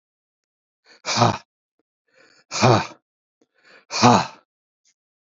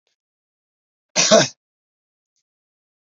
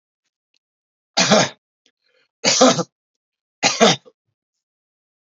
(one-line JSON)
{"exhalation_length": "5.3 s", "exhalation_amplitude": 28288, "exhalation_signal_mean_std_ratio": 0.31, "cough_length": "3.2 s", "cough_amplitude": 30974, "cough_signal_mean_std_ratio": 0.23, "three_cough_length": "5.4 s", "three_cough_amplitude": 29601, "three_cough_signal_mean_std_ratio": 0.33, "survey_phase": "beta (2021-08-13 to 2022-03-07)", "age": "65+", "gender": "Male", "wearing_mask": "No", "symptom_none": true, "smoker_status": "Never smoked", "respiratory_condition_asthma": false, "respiratory_condition_other": false, "recruitment_source": "REACT", "submission_delay": "2 days", "covid_test_result": "Negative", "covid_test_method": "RT-qPCR"}